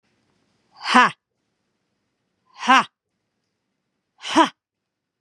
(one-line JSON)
{"exhalation_length": "5.2 s", "exhalation_amplitude": 32767, "exhalation_signal_mean_std_ratio": 0.24, "survey_phase": "beta (2021-08-13 to 2022-03-07)", "age": "45-64", "gender": "Female", "wearing_mask": "No", "symptom_none": true, "smoker_status": "Never smoked", "respiratory_condition_asthma": false, "respiratory_condition_other": true, "recruitment_source": "REACT", "submission_delay": "2 days", "covid_test_result": "Negative", "covid_test_method": "RT-qPCR", "influenza_a_test_result": "Negative", "influenza_b_test_result": "Negative"}